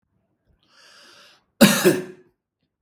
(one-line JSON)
{"cough_length": "2.8 s", "cough_amplitude": 32768, "cough_signal_mean_std_ratio": 0.28, "survey_phase": "beta (2021-08-13 to 2022-03-07)", "age": "18-44", "gender": "Male", "wearing_mask": "No", "symptom_none": true, "smoker_status": "Never smoked", "respiratory_condition_asthma": false, "respiratory_condition_other": false, "recruitment_source": "REACT", "submission_delay": "1 day", "covid_test_result": "Negative", "covid_test_method": "RT-qPCR", "influenza_a_test_result": "Unknown/Void", "influenza_b_test_result": "Unknown/Void"}